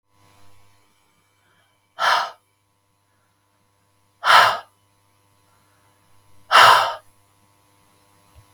{"exhalation_length": "8.5 s", "exhalation_amplitude": 32768, "exhalation_signal_mean_std_ratio": 0.26, "survey_phase": "beta (2021-08-13 to 2022-03-07)", "age": "45-64", "gender": "Female", "wearing_mask": "No", "symptom_cough_any": true, "symptom_runny_or_blocked_nose": true, "symptom_fatigue": true, "symptom_fever_high_temperature": true, "symptom_headache": true, "symptom_onset": "2 days", "smoker_status": "Never smoked", "respiratory_condition_asthma": false, "respiratory_condition_other": false, "recruitment_source": "Test and Trace", "submission_delay": "1 day", "covid_test_result": "Positive", "covid_test_method": "RT-qPCR", "covid_ct_value": 18.9, "covid_ct_gene": "ORF1ab gene", "covid_ct_mean": 18.9, "covid_viral_load": "610000 copies/ml", "covid_viral_load_category": "Low viral load (10K-1M copies/ml)"}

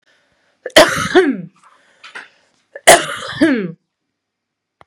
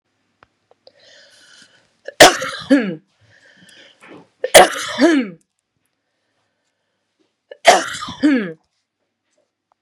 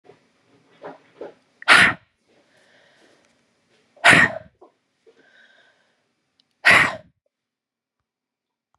{"cough_length": "4.9 s", "cough_amplitude": 32768, "cough_signal_mean_std_ratio": 0.36, "three_cough_length": "9.8 s", "three_cough_amplitude": 32768, "three_cough_signal_mean_std_ratio": 0.29, "exhalation_length": "8.8 s", "exhalation_amplitude": 32621, "exhalation_signal_mean_std_ratio": 0.24, "survey_phase": "beta (2021-08-13 to 2022-03-07)", "age": "45-64", "gender": "Female", "wearing_mask": "No", "symptom_cough_any": true, "symptom_runny_or_blocked_nose": true, "symptom_sore_throat": true, "symptom_onset": "12 days", "smoker_status": "Never smoked", "respiratory_condition_asthma": true, "respiratory_condition_other": false, "recruitment_source": "REACT", "submission_delay": "3 days", "covid_test_result": "Negative", "covid_test_method": "RT-qPCR", "influenza_a_test_result": "Negative", "influenza_b_test_result": "Negative"}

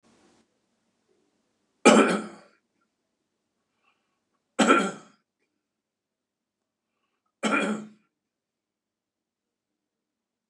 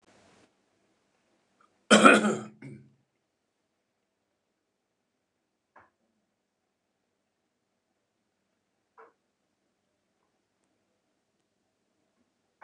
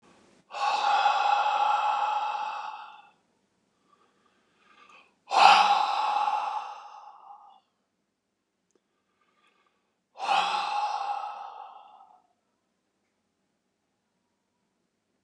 {"three_cough_length": "10.5 s", "three_cough_amplitude": 25273, "three_cough_signal_mean_std_ratio": 0.23, "cough_length": "12.6 s", "cough_amplitude": 29203, "cough_signal_mean_std_ratio": 0.14, "exhalation_length": "15.2 s", "exhalation_amplitude": 24800, "exhalation_signal_mean_std_ratio": 0.44, "survey_phase": "beta (2021-08-13 to 2022-03-07)", "age": "65+", "gender": "Male", "wearing_mask": "No", "symptom_none": true, "smoker_status": "Ex-smoker", "respiratory_condition_asthma": false, "respiratory_condition_other": false, "recruitment_source": "REACT", "submission_delay": "1 day", "covid_test_result": "Negative", "covid_test_method": "RT-qPCR", "influenza_a_test_result": "Negative", "influenza_b_test_result": "Negative"}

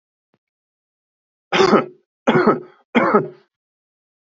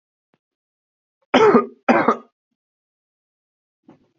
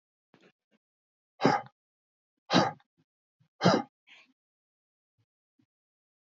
{"three_cough_length": "4.4 s", "three_cough_amplitude": 27362, "three_cough_signal_mean_std_ratio": 0.37, "cough_length": "4.2 s", "cough_amplitude": 27261, "cough_signal_mean_std_ratio": 0.29, "exhalation_length": "6.2 s", "exhalation_amplitude": 12292, "exhalation_signal_mean_std_ratio": 0.23, "survey_phase": "beta (2021-08-13 to 2022-03-07)", "age": "45-64", "gender": "Male", "wearing_mask": "No", "symptom_none": true, "smoker_status": "Never smoked", "respiratory_condition_asthma": false, "respiratory_condition_other": false, "recruitment_source": "REACT", "submission_delay": "2 days", "covid_test_result": "Negative", "covid_test_method": "RT-qPCR", "influenza_a_test_result": "Negative", "influenza_b_test_result": "Negative"}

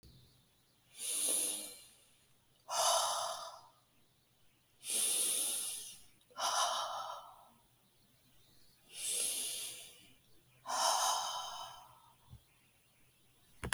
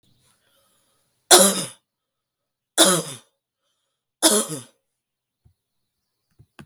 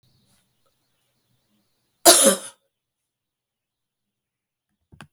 {"exhalation_length": "13.7 s", "exhalation_amplitude": 6308, "exhalation_signal_mean_std_ratio": 0.54, "three_cough_length": "6.7 s", "three_cough_amplitude": 32768, "three_cough_signal_mean_std_ratio": 0.26, "cough_length": "5.1 s", "cough_amplitude": 32766, "cough_signal_mean_std_ratio": 0.19, "survey_phase": "beta (2021-08-13 to 2022-03-07)", "age": "45-64", "gender": "Female", "wearing_mask": "No", "symptom_none": true, "smoker_status": "Ex-smoker", "respiratory_condition_asthma": false, "respiratory_condition_other": false, "recruitment_source": "Test and Trace", "submission_delay": "1 day", "covid_test_result": "Negative", "covid_test_method": "RT-qPCR"}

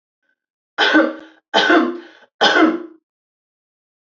{"three_cough_length": "4.0 s", "three_cough_amplitude": 28570, "three_cough_signal_mean_std_ratio": 0.45, "survey_phase": "beta (2021-08-13 to 2022-03-07)", "age": "18-44", "gender": "Female", "wearing_mask": "No", "symptom_runny_or_blocked_nose": true, "smoker_status": "Never smoked", "respiratory_condition_asthma": true, "respiratory_condition_other": false, "recruitment_source": "REACT", "submission_delay": "2 days", "covid_test_result": "Negative", "covid_test_method": "RT-qPCR", "influenza_a_test_result": "Negative", "influenza_b_test_result": "Negative"}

